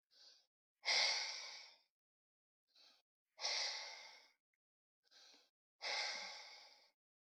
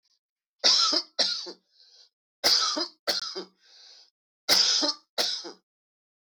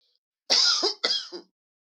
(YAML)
exhalation_length: 7.3 s
exhalation_amplitude: 1968
exhalation_signal_mean_std_ratio: 0.39
three_cough_length: 6.3 s
three_cough_amplitude: 18067
three_cough_signal_mean_std_ratio: 0.45
cough_length: 1.9 s
cough_amplitude: 16520
cough_signal_mean_std_ratio: 0.49
survey_phase: beta (2021-08-13 to 2022-03-07)
age: 45-64
gender: Male
wearing_mask: 'No'
symptom_none: true
smoker_status: Ex-smoker
respiratory_condition_asthma: false
respiratory_condition_other: false
recruitment_source: REACT
submission_delay: 2 days
covid_test_result: Negative
covid_test_method: RT-qPCR